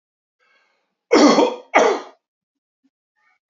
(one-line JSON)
{"cough_length": "3.5 s", "cough_amplitude": 28088, "cough_signal_mean_std_ratio": 0.35, "survey_phase": "alpha (2021-03-01 to 2021-08-12)", "age": "45-64", "gender": "Male", "wearing_mask": "No", "symptom_none": true, "smoker_status": "Never smoked", "respiratory_condition_asthma": false, "respiratory_condition_other": false, "recruitment_source": "Test and Trace", "submission_delay": "2 days", "covid_test_result": "Positive", "covid_test_method": "RT-qPCR", "covid_ct_value": 27.2, "covid_ct_gene": "N gene"}